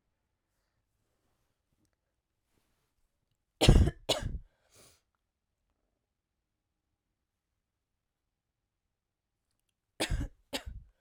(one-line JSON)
{"cough_length": "11.0 s", "cough_amplitude": 16230, "cough_signal_mean_std_ratio": 0.18, "survey_phase": "alpha (2021-03-01 to 2021-08-12)", "age": "18-44", "gender": "Female", "wearing_mask": "No", "symptom_none": true, "symptom_onset": "7 days", "smoker_status": "Never smoked", "respiratory_condition_asthma": true, "respiratory_condition_other": false, "recruitment_source": "Test and Trace", "submission_delay": "2 days", "covid_test_result": "Positive", "covid_test_method": "RT-qPCR", "covid_ct_value": 20.5, "covid_ct_gene": "ORF1ab gene", "covid_ct_mean": 21.1, "covid_viral_load": "120000 copies/ml", "covid_viral_load_category": "Low viral load (10K-1M copies/ml)"}